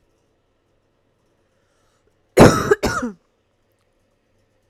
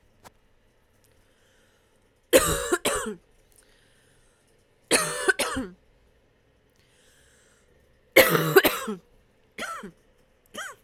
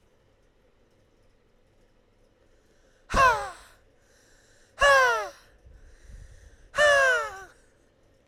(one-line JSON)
{"cough_length": "4.7 s", "cough_amplitude": 32768, "cough_signal_mean_std_ratio": 0.23, "three_cough_length": "10.8 s", "three_cough_amplitude": 28314, "three_cough_signal_mean_std_ratio": 0.31, "exhalation_length": "8.3 s", "exhalation_amplitude": 11957, "exhalation_signal_mean_std_ratio": 0.35, "survey_phase": "beta (2021-08-13 to 2022-03-07)", "age": "18-44", "gender": "Female", "wearing_mask": "No", "symptom_sore_throat": true, "symptom_loss_of_taste": true, "symptom_onset": "8 days", "smoker_status": "Never smoked", "respiratory_condition_asthma": false, "respiratory_condition_other": false, "recruitment_source": "Test and Trace", "submission_delay": "1 day", "covid_test_result": "Positive", "covid_test_method": "RT-qPCR"}